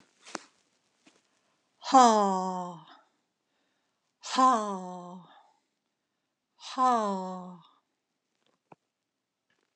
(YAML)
exhalation_length: 9.8 s
exhalation_amplitude: 13602
exhalation_signal_mean_std_ratio: 0.31
survey_phase: beta (2021-08-13 to 2022-03-07)
age: 65+
gender: Female
wearing_mask: 'No'
symptom_none: true
smoker_status: Never smoked
respiratory_condition_asthma: false
respiratory_condition_other: false
recruitment_source: REACT
submission_delay: 1 day
covid_test_result: Negative
covid_test_method: RT-qPCR
influenza_a_test_result: Negative
influenza_b_test_result: Negative